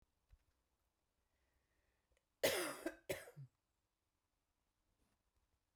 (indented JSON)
{
  "cough_length": "5.8 s",
  "cough_amplitude": 2276,
  "cough_signal_mean_std_ratio": 0.24,
  "survey_phase": "beta (2021-08-13 to 2022-03-07)",
  "age": "65+",
  "gender": "Female",
  "wearing_mask": "No",
  "symptom_none": true,
  "smoker_status": "Never smoked",
  "respiratory_condition_asthma": false,
  "respiratory_condition_other": false,
  "recruitment_source": "REACT",
  "submission_delay": "2 days",
  "covid_test_result": "Negative",
  "covid_test_method": "RT-qPCR"
}